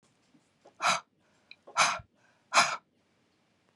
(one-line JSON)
{"exhalation_length": "3.8 s", "exhalation_amplitude": 13734, "exhalation_signal_mean_std_ratio": 0.31, "survey_phase": "beta (2021-08-13 to 2022-03-07)", "age": "45-64", "gender": "Female", "wearing_mask": "No", "symptom_none": true, "symptom_onset": "4 days", "smoker_status": "Ex-smoker", "respiratory_condition_asthma": false, "respiratory_condition_other": false, "recruitment_source": "REACT", "submission_delay": "2 days", "covid_test_result": "Negative", "covid_test_method": "RT-qPCR", "influenza_a_test_result": "Negative", "influenza_b_test_result": "Negative"}